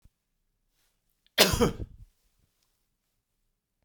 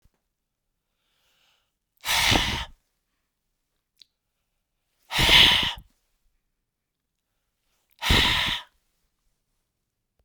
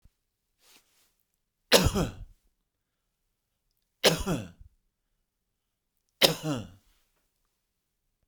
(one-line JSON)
{"cough_length": "3.8 s", "cough_amplitude": 24241, "cough_signal_mean_std_ratio": 0.23, "exhalation_length": "10.2 s", "exhalation_amplitude": 25312, "exhalation_signal_mean_std_ratio": 0.31, "three_cough_length": "8.3 s", "three_cough_amplitude": 23628, "three_cough_signal_mean_std_ratio": 0.24, "survey_phase": "beta (2021-08-13 to 2022-03-07)", "age": "45-64", "gender": "Male", "wearing_mask": "No", "symptom_none": true, "smoker_status": "Never smoked", "respiratory_condition_asthma": false, "respiratory_condition_other": false, "recruitment_source": "REACT", "submission_delay": "0 days", "covid_test_result": "Negative", "covid_test_method": "RT-qPCR", "influenza_a_test_result": "Negative", "influenza_b_test_result": "Negative"}